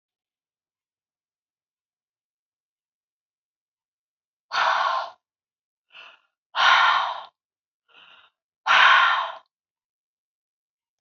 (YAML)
exhalation_length: 11.0 s
exhalation_amplitude: 22340
exhalation_signal_mean_std_ratio: 0.31
survey_phase: alpha (2021-03-01 to 2021-08-12)
age: 65+
gender: Female
wearing_mask: 'No'
symptom_none: true
smoker_status: Ex-smoker
respiratory_condition_asthma: false
respiratory_condition_other: false
recruitment_source: REACT
submission_delay: 2 days
covid_test_result: Negative
covid_test_method: RT-qPCR